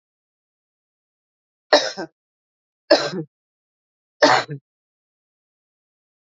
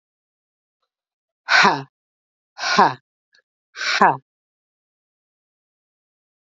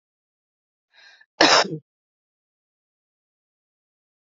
three_cough_length: 6.4 s
three_cough_amplitude: 28217
three_cough_signal_mean_std_ratio: 0.23
exhalation_length: 6.5 s
exhalation_amplitude: 28738
exhalation_signal_mean_std_ratio: 0.27
cough_length: 4.3 s
cough_amplitude: 30667
cough_signal_mean_std_ratio: 0.2
survey_phase: beta (2021-08-13 to 2022-03-07)
age: 45-64
gender: Female
wearing_mask: 'No'
symptom_cough_any: true
symptom_runny_or_blocked_nose: true
symptom_sore_throat: true
symptom_fatigue: true
symptom_fever_high_temperature: true
symptom_headache: true
symptom_other: true
symptom_onset: 3 days
smoker_status: Never smoked
respiratory_condition_asthma: false
respiratory_condition_other: false
recruitment_source: Test and Trace
submission_delay: 2 days
covid_test_result: Positive
covid_test_method: RT-qPCR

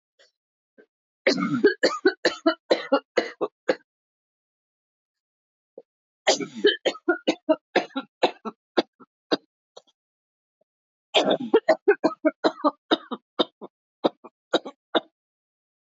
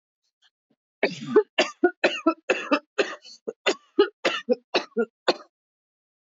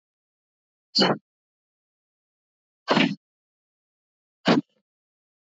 three_cough_length: 15.9 s
three_cough_amplitude: 16253
three_cough_signal_mean_std_ratio: 0.33
cough_length: 6.3 s
cough_amplitude: 16064
cough_signal_mean_std_ratio: 0.37
exhalation_length: 5.5 s
exhalation_amplitude: 14243
exhalation_signal_mean_std_ratio: 0.25
survey_phase: beta (2021-08-13 to 2022-03-07)
age: 45-64
gender: Female
wearing_mask: 'No'
symptom_cough_any: true
symptom_runny_or_blocked_nose: true
symptom_shortness_of_breath: true
symptom_sore_throat: true
symptom_fatigue: true
symptom_fever_high_temperature: true
symptom_headache: true
symptom_onset: 7 days
smoker_status: Never smoked
respiratory_condition_asthma: false
respiratory_condition_other: false
recruitment_source: Test and Trace
submission_delay: 2 days
covid_test_result: Positive
covid_test_method: RT-qPCR
covid_ct_value: 17.0
covid_ct_gene: N gene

